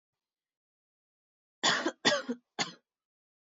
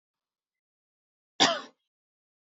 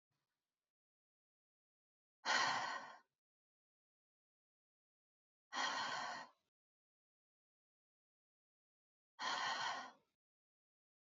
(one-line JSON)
{"three_cough_length": "3.6 s", "three_cough_amplitude": 9391, "three_cough_signal_mean_std_ratio": 0.3, "cough_length": "2.6 s", "cough_amplitude": 15732, "cough_signal_mean_std_ratio": 0.2, "exhalation_length": "11.1 s", "exhalation_amplitude": 1904, "exhalation_signal_mean_std_ratio": 0.33, "survey_phase": "beta (2021-08-13 to 2022-03-07)", "age": "18-44", "gender": "Female", "wearing_mask": "No", "symptom_fatigue": true, "symptom_headache": true, "smoker_status": "Never smoked", "respiratory_condition_asthma": false, "respiratory_condition_other": false, "recruitment_source": "Test and Trace", "submission_delay": "1 day", "covid_test_result": "Positive", "covid_test_method": "LFT"}